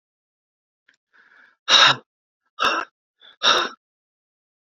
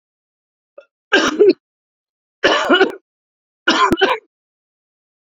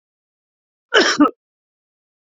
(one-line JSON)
{"exhalation_length": "4.8 s", "exhalation_amplitude": 31232, "exhalation_signal_mean_std_ratio": 0.3, "three_cough_length": "5.3 s", "three_cough_amplitude": 30953, "three_cough_signal_mean_std_ratio": 0.39, "cough_length": "2.4 s", "cough_amplitude": 28521, "cough_signal_mean_std_ratio": 0.29, "survey_phase": "alpha (2021-03-01 to 2021-08-12)", "age": "45-64", "gender": "Male", "wearing_mask": "No", "symptom_cough_any": true, "symptom_new_continuous_cough": true, "symptom_shortness_of_breath": true, "symptom_abdominal_pain": true, "symptom_fatigue": true, "symptom_headache": true, "smoker_status": "Never smoked", "respiratory_condition_asthma": false, "respiratory_condition_other": false, "recruitment_source": "Test and Trace", "submission_delay": "2 days", "covid_test_result": "Positive", "covid_test_method": "RT-qPCR", "covid_ct_value": 20.8, "covid_ct_gene": "ORF1ab gene"}